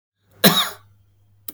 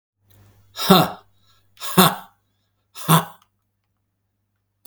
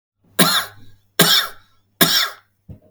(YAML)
cough_length: 1.5 s
cough_amplitude: 32768
cough_signal_mean_std_ratio: 0.31
exhalation_length: 4.9 s
exhalation_amplitude: 32768
exhalation_signal_mean_std_ratio: 0.28
three_cough_length: 2.9 s
three_cough_amplitude: 32768
three_cough_signal_mean_std_ratio: 0.44
survey_phase: beta (2021-08-13 to 2022-03-07)
age: 45-64
gender: Male
wearing_mask: 'No'
symptom_none: true
smoker_status: Ex-smoker
respiratory_condition_asthma: false
respiratory_condition_other: false
recruitment_source: REACT
submission_delay: 6 days
covid_test_result: Negative
covid_test_method: RT-qPCR
influenza_a_test_result: Negative
influenza_b_test_result: Negative